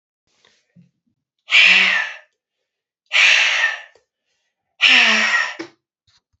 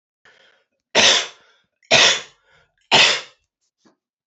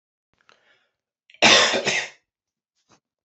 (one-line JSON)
{"exhalation_length": "6.4 s", "exhalation_amplitude": 30400, "exhalation_signal_mean_std_ratio": 0.45, "three_cough_length": "4.3 s", "three_cough_amplitude": 31943, "three_cough_signal_mean_std_ratio": 0.36, "cough_length": "3.2 s", "cough_amplitude": 27266, "cough_signal_mean_std_ratio": 0.32, "survey_phase": "alpha (2021-03-01 to 2021-08-12)", "age": "45-64", "gender": "Male", "wearing_mask": "No", "symptom_cough_any": true, "symptom_fatigue": true, "symptom_headache": true, "symptom_change_to_sense_of_smell_or_taste": true, "smoker_status": "Never smoked", "respiratory_condition_asthma": false, "respiratory_condition_other": false, "recruitment_source": "Test and Trace", "submission_delay": "1 day", "covid_test_result": "Positive", "covid_test_method": "RT-qPCR", "covid_ct_value": 29.8, "covid_ct_gene": "N gene"}